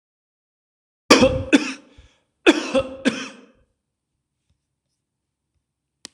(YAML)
three_cough_length: 6.1 s
three_cough_amplitude: 26028
three_cough_signal_mean_std_ratio: 0.28
survey_phase: beta (2021-08-13 to 2022-03-07)
age: 45-64
gender: Male
wearing_mask: 'No'
symptom_runny_or_blocked_nose: true
symptom_onset: 13 days
smoker_status: Never smoked
respiratory_condition_asthma: false
respiratory_condition_other: false
recruitment_source: REACT
submission_delay: 1 day
covid_test_result: Negative
covid_test_method: RT-qPCR
influenza_a_test_result: Unknown/Void
influenza_b_test_result: Unknown/Void